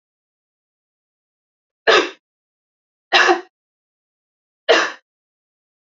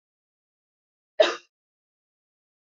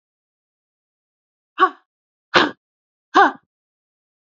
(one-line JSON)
{"three_cough_length": "5.8 s", "three_cough_amplitude": 30579, "three_cough_signal_mean_std_ratio": 0.26, "cough_length": "2.7 s", "cough_amplitude": 17404, "cough_signal_mean_std_ratio": 0.15, "exhalation_length": "4.3 s", "exhalation_amplitude": 28720, "exhalation_signal_mean_std_ratio": 0.23, "survey_phase": "beta (2021-08-13 to 2022-03-07)", "age": "18-44", "gender": "Female", "wearing_mask": "No", "symptom_none": true, "symptom_onset": "12 days", "smoker_status": "Never smoked", "respiratory_condition_asthma": false, "respiratory_condition_other": false, "recruitment_source": "REACT", "submission_delay": "2 days", "covid_test_result": "Negative", "covid_test_method": "RT-qPCR", "influenza_a_test_result": "Negative", "influenza_b_test_result": "Negative"}